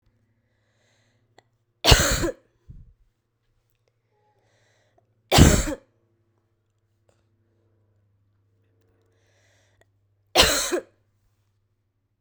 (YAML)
three_cough_length: 12.2 s
three_cough_amplitude: 32768
three_cough_signal_mean_std_ratio: 0.23
survey_phase: beta (2021-08-13 to 2022-03-07)
age: 18-44
gender: Male
wearing_mask: 'No'
symptom_new_continuous_cough: true
symptom_runny_or_blocked_nose: true
symptom_change_to_sense_of_smell_or_taste: true
symptom_loss_of_taste: true
symptom_other: true
smoker_status: Never smoked
respiratory_condition_asthma: false
respiratory_condition_other: false
recruitment_source: Test and Trace
submission_delay: 2 days
covid_test_result: Negative
covid_test_method: RT-qPCR